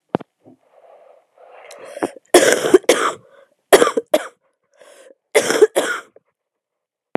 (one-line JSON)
{"cough_length": "7.2 s", "cough_amplitude": 32768, "cough_signal_mean_std_ratio": 0.33, "survey_phase": "beta (2021-08-13 to 2022-03-07)", "age": "18-44", "gender": "Female", "wearing_mask": "No", "symptom_cough_any": true, "symptom_sore_throat": true, "symptom_fatigue": true, "symptom_change_to_sense_of_smell_or_taste": true, "symptom_onset": "4 days", "smoker_status": "Never smoked", "respiratory_condition_asthma": false, "respiratory_condition_other": false, "recruitment_source": "Test and Trace", "submission_delay": "2 days", "covid_test_result": "Positive", "covid_test_method": "RT-qPCR", "covid_ct_value": 15.8, "covid_ct_gene": "ORF1ab gene", "covid_ct_mean": 16.2, "covid_viral_load": "4900000 copies/ml", "covid_viral_load_category": "High viral load (>1M copies/ml)"}